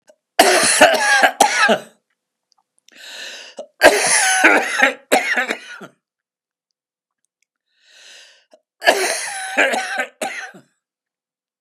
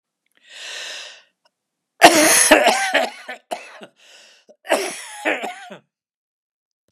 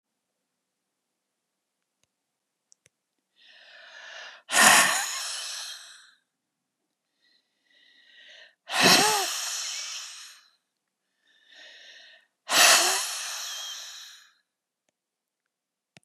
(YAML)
three_cough_length: 11.6 s
three_cough_amplitude: 32768
three_cough_signal_mean_std_ratio: 0.46
cough_length: 6.9 s
cough_amplitude: 32768
cough_signal_mean_std_ratio: 0.37
exhalation_length: 16.0 s
exhalation_amplitude: 23394
exhalation_signal_mean_std_ratio: 0.32
survey_phase: beta (2021-08-13 to 2022-03-07)
age: 65+
gender: Male
wearing_mask: 'No'
symptom_none: true
symptom_onset: 13 days
smoker_status: Never smoked
respiratory_condition_asthma: false
respiratory_condition_other: false
recruitment_source: REACT
submission_delay: 2 days
covid_test_result: Negative
covid_test_method: RT-qPCR
influenza_a_test_result: Negative
influenza_b_test_result: Negative